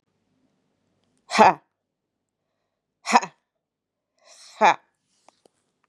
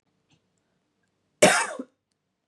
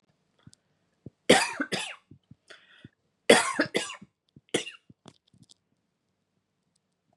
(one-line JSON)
{"exhalation_length": "5.9 s", "exhalation_amplitude": 32640, "exhalation_signal_mean_std_ratio": 0.2, "cough_length": "2.5 s", "cough_amplitude": 25320, "cough_signal_mean_std_ratio": 0.25, "three_cough_length": "7.2 s", "three_cough_amplitude": 23630, "three_cough_signal_mean_std_ratio": 0.24, "survey_phase": "beta (2021-08-13 to 2022-03-07)", "age": "45-64", "gender": "Female", "wearing_mask": "No", "symptom_cough_any": true, "symptom_sore_throat": true, "smoker_status": "Never smoked", "respiratory_condition_asthma": false, "respiratory_condition_other": false, "recruitment_source": "Test and Trace", "submission_delay": "1 day", "covid_test_result": "Negative", "covid_test_method": "RT-qPCR"}